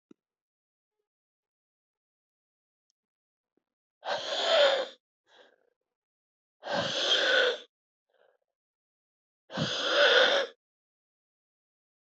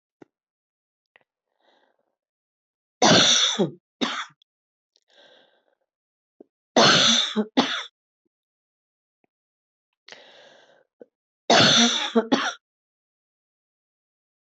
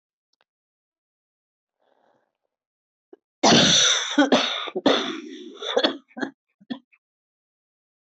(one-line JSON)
{"exhalation_length": "12.1 s", "exhalation_amplitude": 10994, "exhalation_signal_mean_std_ratio": 0.36, "three_cough_length": "14.5 s", "three_cough_amplitude": 23338, "three_cough_signal_mean_std_ratio": 0.33, "cough_length": "8.0 s", "cough_amplitude": 22014, "cough_signal_mean_std_ratio": 0.37, "survey_phase": "beta (2021-08-13 to 2022-03-07)", "age": "45-64", "gender": "Female", "wearing_mask": "No", "symptom_cough_any": true, "symptom_runny_or_blocked_nose": true, "symptom_fatigue": true, "symptom_fever_high_temperature": true, "symptom_headache": true, "symptom_other": true, "smoker_status": "Ex-smoker", "respiratory_condition_asthma": false, "respiratory_condition_other": false, "recruitment_source": "Test and Trace", "submission_delay": "2 days", "covid_test_result": "Positive", "covid_test_method": "ePCR"}